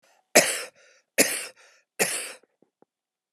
{"three_cough_length": "3.3 s", "three_cough_amplitude": 27593, "three_cough_signal_mean_std_ratio": 0.31, "survey_phase": "alpha (2021-03-01 to 2021-08-12)", "age": "45-64", "gender": "Female", "wearing_mask": "No", "symptom_none": true, "smoker_status": "Never smoked", "respiratory_condition_asthma": false, "respiratory_condition_other": false, "recruitment_source": "REACT", "submission_delay": "9 days", "covid_test_result": "Negative", "covid_test_method": "RT-qPCR"}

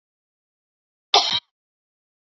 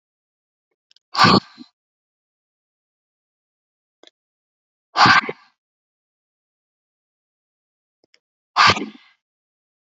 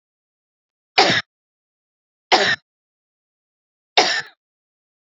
{"cough_length": "2.4 s", "cough_amplitude": 26379, "cough_signal_mean_std_ratio": 0.22, "exhalation_length": "10.0 s", "exhalation_amplitude": 32719, "exhalation_signal_mean_std_ratio": 0.21, "three_cough_length": "5.0 s", "three_cough_amplitude": 32675, "three_cough_signal_mean_std_ratio": 0.28, "survey_phase": "beta (2021-08-13 to 2022-03-07)", "age": "18-44", "gender": "Female", "wearing_mask": "No", "symptom_none": true, "smoker_status": "Never smoked", "respiratory_condition_asthma": false, "respiratory_condition_other": false, "recruitment_source": "REACT", "submission_delay": "1 day", "covid_test_result": "Negative", "covid_test_method": "RT-qPCR", "influenza_a_test_result": "Negative", "influenza_b_test_result": "Negative"}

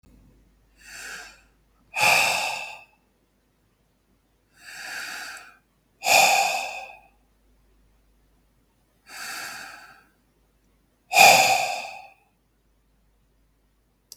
{"exhalation_length": "14.2 s", "exhalation_amplitude": 32244, "exhalation_signal_mean_std_ratio": 0.32, "survey_phase": "beta (2021-08-13 to 2022-03-07)", "age": "45-64", "gender": "Male", "wearing_mask": "No", "symptom_none": true, "smoker_status": "Never smoked", "respiratory_condition_asthma": false, "respiratory_condition_other": false, "recruitment_source": "REACT", "submission_delay": "1 day", "covid_test_result": "Negative", "covid_test_method": "RT-qPCR", "influenza_a_test_result": "Negative", "influenza_b_test_result": "Negative"}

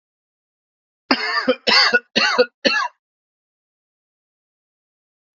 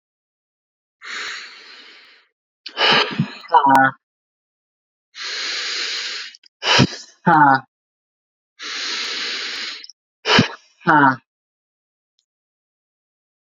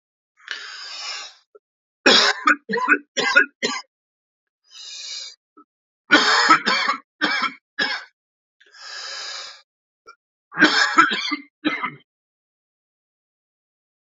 {"cough_length": "5.4 s", "cough_amplitude": 30911, "cough_signal_mean_std_ratio": 0.36, "exhalation_length": "13.6 s", "exhalation_amplitude": 32767, "exhalation_signal_mean_std_ratio": 0.39, "three_cough_length": "14.2 s", "three_cough_amplitude": 32062, "three_cough_signal_mean_std_ratio": 0.4, "survey_phase": "beta (2021-08-13 to 2022-03-07)", "age": "18-44", "gender": "Male", "wearing_mask": "No", "symptom_runny_or_blocked_nose": true, "symptom_onset": "12 days", "smoker_status": "Ex-smoker", "respiratory_condition_asthma": false, "respiratory_condition_other": false, "recruitment_source": "REACT", "submission_delay": "2 days", "covid_test_result": "Negative", "covid_test_method": "RT-qPCR", "influenza_a_test_result": "Negative", "influenza_b_test_result": "Negative"}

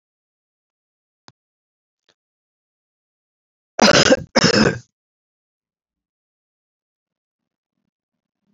{"cough_length": "8.5 s", "cough_amplitude": 30377, "cough_signal_mean_std_ratio": 0.22, "survey_phase": "beta (2021-08-13 to 2022-03-07)", "age": "65+", "gender": "Male", "wearing_mask": "No", "symptom_cough_any": true, "symptom_runny_or_blocked_nose": true, "symptom_onset": "12 days", "smoker_status": "Never smoked", "respiratory_condition_asthma": false, "respiratory_condition_other": false, "recruitment_source": "REACT", "submission_delay": "1 day", "covid_test_result": "Negative", "covid_test_method": "RT-qPCR", "influenza_a_test_result": "Negative", "influenza_b_test_result": "Negative"}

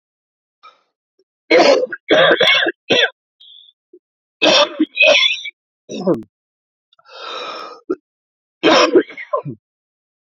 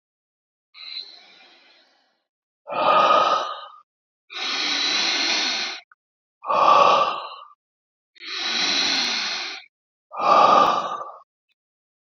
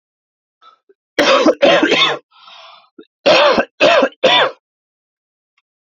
{"three_cough_length": "10.3 s", "three_cough_amplitude": 32767, "three_cough_signal_mean_std_ratio": 0.44, "exhalation_length": "12.0 s", "exhalation_amplitude": 25470, "exhalation_signal_mean_std_ratio": 0.53, "cough_length": "5.8 s", "cough_amplitude": 31044, "cough_signal_mean_std_ratio": 0.49, "survey_phase": "beta (2021-08-13 to 2022-03-07)", "age": "18-44", "gender": "Male", "wearing_mask": "No", "symptom_cough_any": true, "symptom_runny_or_blocked_nose": true, "symptom_change_to_sense_of_smell_or_taste": true, "smoker_status": "Never smoked", "respiratory_condition_asthma": false, "respiratory_condition_other": false, "recruitment_source": "REACT", "submission_delay": "1 day", "covid_test_result": "Negative", "covid_test_method": "RT-qPCR", "influenza_a_test_result": "Negative", "influenza_b_test_result": "Negative"}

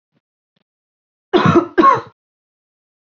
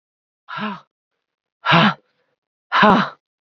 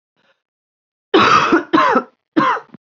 {"cough_length": "3.1 s", "cough_amplitude": 27870, "cough_signal_mean_std_ratio": 0.34, "exhalation_length": "3.4 s", "exhalation_amplitude": 29125, "exhalation_signal_mean_std_ratio": 0.37, "three_cough_length": "2.9 s", "three_cough_amplitude": 31353, "three_cough_signal_mean_std_ratio": 0.51, "survey_phase": "beta (2021-08-13 to 2022-03-07)", "age": "18-44", "gender": "Female", "wearing_mask": "No", "symptom_cough_any": true, "symptom_new_continuous_cough": true, "symptom_runny_or_blocked_nose": true, "symptom_abdominal_pain": true, "symptom_fatigue": true, "symptom_fever_high_temperature": true, "symptom_headache": true, "symptom_change_to_sense_of_smell_or_taste": true, "symptom_loss_of_taste": true, "smoker_status": "Never smoked", "respiratory_condition_asthma": false, "respiratory_condition_other": false, "recruitment_source": "Test and Trace", "submission_delay": "2 days", "covid_test_result": "Positive", "covid_test_method": "RT-qPCR", "covid_ct_value": 37.0, "covid_ct_gene": "ORF1ab gene"}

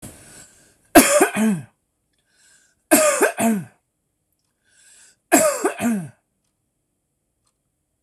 {"three_cough_length": "8.0 s", "three_cough_amplitude": 26028, "three_cough_signal_mean_std_ratio": 0.37, "survey_phase": "beta (2021-08-13 to 2022-03-07)", "age": "45-64", "gender": "Male", "wearing_mask": "No", "symptom_none": true, "smoker_status": "Never smoked", "respiratory_condition_asthma": false, "respiratory_condition_other": false, "recruitment_source": "REACT", "submission_delay": "2 days", "covid_test_result": "Negative", "covid_test_method": "RT-qPCR", "influenza_a_test_result": "Negative", "influenza_b_test_result": "Negative"}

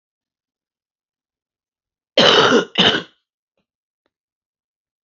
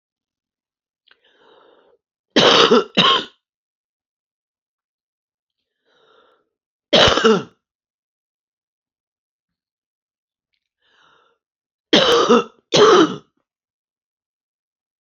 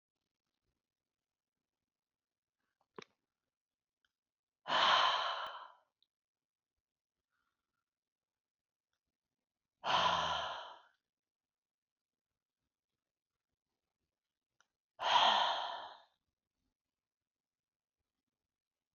{"cough_length": "5.0 s", "cough_amplitude": 30151, "cough_signal_mean_std_ratio": 0.3, "three_cough_length": "15.0 s", "three_cough_amplitude": 32767, "three_cough_signal_mean_std_ratio": 0.3, "exhalation_length": "18.9 s", "exhalation_amplitude": 4349, "exhalation_signal_mean_std_ratio": 0.27, "survey_phase": "beta (2021-08-13 to 2022-03-07)", "age": "65+", "gender": "Female", "wearing_mask": "No", "symptom_none": true, "smoker_status": "Current smoker (11 or more cigarettes per day)", "respiratory_condition_asthma": false, "respiratory_condition_other": true, "recruitment_source": "REACT", "submission_delay": "3 days", "covid_test_result": "Negative", "covid_test_method": "RT-qPCR", "influenza_a_test_result": "Negative", "influenza_b_test_result": "Negative"}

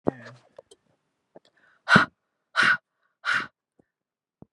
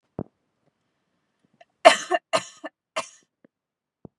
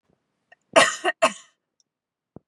{"exhalation_length": "4.5 s", "exhalation_amplitude": 28030, "exhalation_signal_mean_std_ratio": 0.27, "three_cough_length": "4.2 s", "three_cough_amplitude": 32301, "three_cough_signal_mean_std_ratio": 0.19, "cough_length": "2.5 s", "cough_amplitude": 26490, "cough_signal_mean_std_ratio": 0.27, "survey_phase": "beta (2021-08-13 to 2022-03-07)", "age": "18-44", "gender": "Female", "wearing_mask": "No", "symptom_none": true, "smoker_status": "Never smoked", "respiratory_condition_asthma": false, "respiratory_condition_other": false, "recruitment_source": "REACT", "submission_delay": "0 days", "covid_test_result": "Negative", "covid_test_method": "RT-qPCR", "influenza_a_test_result": "Negative", "influenza_b_test_result": "Negative"}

